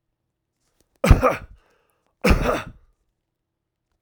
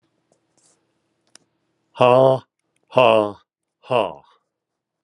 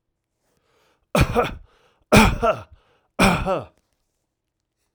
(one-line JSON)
{"cough_length": "4.0 s", "cough_amplitude": 32768, "cough_signal_mean_std_ratio": 0.29, "exhalation_length": "5.0 s", "exhalation_amplitude": 31698, "exhalation_signal_mean_std_ratio": 0.3, "three_cough_length": "4.9 s", "three_cough_amplitude": 32768, "three_cough_signal_mean_std_ratio": 0.36, "survey_phase": "alpha (2021-03-01 to 2021-08-12)", "age": "45-64", "gender": "Male", "wearing_mask": "No", "symptom_none": true, "smoker_status": "Ex-smoker", "respiratory_condition_asthma": false, "respiratory_condition_other": false, "recruitment_source": "REACT", "submission_delay": "1 day", "covid_test_result": "Negative", "covid_test_method": "RT-qPCR"}